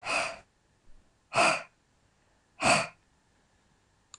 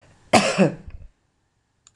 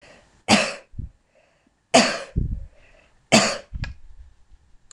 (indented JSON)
{
  "exhalation_length": "4.2 s",
  "exhalation_amplitude": 10345,
  "exhalation_signal_mean_std_ratio": 0.34,
  "cough_length": "2.0 s",
  "cough_amplitude": 25913,
  "cough_signal_mean_std_ratio": 0.35,
  "three_cough_length": "4.9 s",
  "three_cough_amplitude": 26028,
  "three_cough_signal_mean_std_ratio": 0.36,
  "survey_phase": "beta (2021-08-13 to 2022-03-07)",
  "age": "65+",
  "gender": "Female",
  "wearing_mask": "No",
  "symptom_none": true,
  "smoker_status": "Current smoker (1 to 10 cigarettes per day)",
  "respiratory_condition_asthma": false,
  "respiratory_condition_other": false,
  "recruitment_source": "REACT",
  "submission_delay": "2 days",
  "covid_test_result": "Negative",
  "covid_test_method": "RT-qPCR",
  "influenza_a_test_result": "Negative",
  "influenza_b_test_result": "Negative"
}